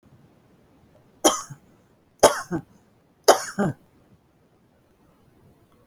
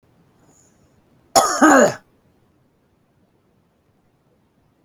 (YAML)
three_cough_length: 5.9 s
three_cough_amplitude: 32013
three_cough_signal_mean_std_ratio: 0.24
cough_length: 4.8 s
cough_amplitude: 32768
cough_signal_mean_std_ratio: 0.27
survey_phase: beta (2021-08-13 to 2022-03-07)
age: 65+
gender: Female
wearing_mask: 'No'
symptom_none: true
smoker_status: Never smoked
respiratory_condition_asthma: true
respiratory_condition_other: false
recruitment_source: REACT
submission_delay: 1 day
covid_test_result: Negative
covid_test_method: RT-qPCR